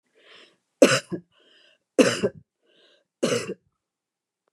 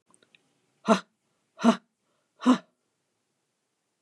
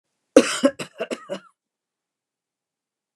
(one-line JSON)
{"three_cough_length": "4.5 s", "three_cough_amplitude": 27843, "three_cough_signal_mean_std_ratio": 0.28, "exhalation_length": "4.0 s", "exhalation_amplitude": 16155, "exhalation_signal_mean_std_ratio": 0.23, "cough_length": "3.2 s", "cough_amplitude": 29204, "cough_signal_mean_std_ratio": 0.23, "survey_phase": "beta (2021-08-13 to 2022-03-07)", "age": "65+", "gender": "Female", "wearing_mask": "No", "symptom_none": true, "smoker_status": "Prefer not to say", "respiratory_condition_asthma": false, "respiratory_condition_other": false, "recruitment_source": "REACT", "submission_delay": "1 day", "covid_test_result": "Negative", "covid_test_method": "RT-qPCR", "influenza_a_test_result": "Negative", "influenza_b_test_result": "Negative"}